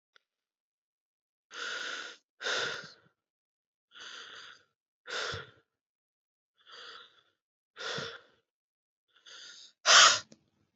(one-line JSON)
{"exhalation_length": "10.8 s", "exhalation_amplitude": 14977, "exhalation_signal_mean_std_ratio": 0.24, "survey_phase": "beta (2021-08-13 to 2022-03-07)", "age": "18-44", "gender": "Female", "wearing_mask": "No", "symptom_cough_any": true, "symptom_fatigue": true, "symptom_headache": true, "symptom_change_to_sense_of_smell_or_taste": true, "symptom_onset": "3 days", "smoker_status": "Current smoker (e-cigarettes or vapes only)", "respiratory_condition_asthma": false, "respiratory_condition_other": false, "recruitment_source": "Test and Trace", "submission_delay": "2 days", "covid_test_result": "Positive", "covid_test_method": "RT-qPCR", "covid_ct_value": 18.0, "covid_ct_gene": "ORF1ab gene", "covid_ct_mean": 18.7, "covid_viral_load": "750000 copies/ml", "covid_viral_load_category": "Low viral load (10K-1M copies/ml)"}